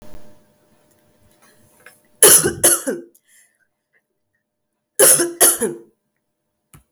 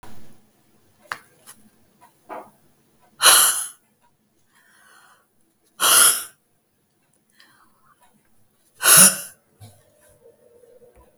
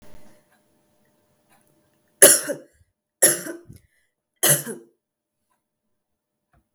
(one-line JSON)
{"cough_length": "6.9 s", "cough_amplitude": 32768, "cough_signal_mean_std_ratio": 0.32, "exhalation_length": "11.2 s", "exhalation_amplitude": 32766, "exhalation_signal_mean_std_ratio": 0.27, "three_cough_length": "6.7 s", "three_cough_amplitude": 32766, "three_cough_signal_mean_std_ratio": 0.23, "survey_phase": "beta (2021-08-13 to 2022-03-07)", "age": "45-64", "wearing_mask": "No", "symptom_cough_any": true, "symptom_runny_or_blocked_nose": true, "symptom_change_to_sense_of_smell_or_taste": true, "smoker_status": "Never smoked", "respiratory_condition_asthma": false, "respiratory_condition_other": false, "recruitment_source": "Test and Trace", "submission_delay": "1 day", "covid_test_result": "Positive", "covid_test_method": "RT-qPCR", "covid_ct_value": 20.8, "covid_ct_gene": "ORF1ab gene"}